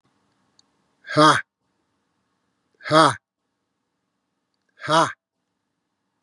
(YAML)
exhalation_length: 6.2 s
exhalation_amplitude: 31680
exhalation_signal_mean_std_ratio: 0.26
survey_phase: beta (2021-08-13 to 2022-03-07)
age: 18-44
wearing_mask: 'No'
symptom_cough_any: true
symptom_runny_or_blocked_nose: true
symptom_sore_throat: true
symptom_fatigue: true
symptom_fever_high_temperature: true
symptom_headache: true
symptom_onset: 8 days
smoker_status: Never smoked
respiratory_condition_asthma: false
respiratory_condition_other: false
recruitment_source: Test and Trace
submission_delay: 6 days
covid_test_result: Positive
covid_test_method: RT-qPCR
covid_ct_value: 14.2
covid_ct_gene: N gene